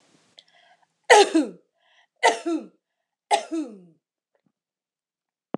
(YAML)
three_cough_length: 5.6 s
three_cough_amplitude: 26028
three_cough_signal_mean_std_ratio: 0.28
survey_phase: beta (2021-08-13 to 2022-03-07)
age: 45-64
gender: Female
wearing_mask: 'No'
symptom_none: true
smoker_status: Never smoked
respiratory_condition_asthma: false
respiratory_condition_other: false
recruitment_source: REACT
submission_delay: 1 day
covid_test_result: Negative
covid_test_method: RT-qPCR